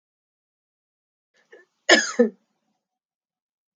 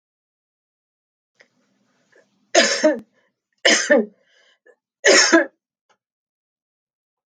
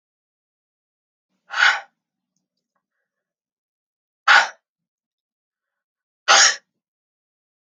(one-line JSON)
{"cough_length": "3.8 s", "cough_amplitude": 27753, "cough_signal_mean_std_ratio": 0.2, "three_cough_length": "7.3 s", "three_cough_amplitude": 32591, "three_cough_signal_mean_std_ratio": 0.3, "exhalation_length": "7.7 s", "exhalation_amplitude": 30059, "exhalation_signal_mean_std_ratio": 0.23, "survey_phase": "alpha (2021-03-01 to 2021-08-12)", "age": "45-64", "gender": "Female", "wearing_mask": "No", "symptom_none": true, "smoker_status": "Never smoked", "respiratory_condition_asthma": false, "respiratory_condition_other": false, "recruitment_source": "REACT", "submission_delay": "19 days", "covid_test_result": "Negative", "covid_test_method": "RT-qPCR"}